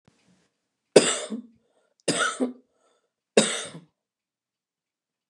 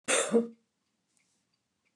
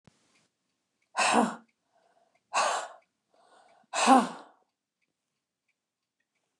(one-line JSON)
{"three_cough_length": "5.3 s", "three_cough_amplitude": 29204, "three_cough_signal_mean_std_ratio": 0.27, "cough_length": "2.0 s", "cough_amplitude": 7046, "cough_signal_mean_std_ratio": 0.34, "exhalation_length": "6.6 s", "exhalation_amplitude": 16905, "exhalation_signal_mean_std_ratio": 0.29, "survey_phase": "beta (2021-08-13 to 2022-03-07)", "age": "45-64", "gender": "Female", "wearing_mask": "No", "symptom_none": true, "smoker_status": "Never smoked", "respiratory_condition_asthma": true, "respiratory_condition_other": false, "recruitment_source": "REACT", "submission_delay": "2 days", "covid_test_result": "Negative", "covid_test_method": "RT-qPCR", "influenza_a_test_result": "Negative", "influenza_b_test_result": "Negative"}